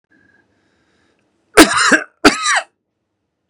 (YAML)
three_cough_length: 3.5 s
three_cough_amplitude: 32768
three_cough_signal_mean_std_ratio: 0.33
survey_phase: beta (2021-08-13 to 2022-03-07)
age: 45-64
gender: Male
wearing_mask: 'No'
symptom_none: true
smoker_status: Never smoked
respiratory_condition_asthma: false
respiratory_condition_other: false
recruitment_source: REACT
submission_delay: 2 days
covid_test_result: Negative
covid_test_method: RT-qPCR
influenza_a_test_result: Negative
influenza_b_test_result: Negative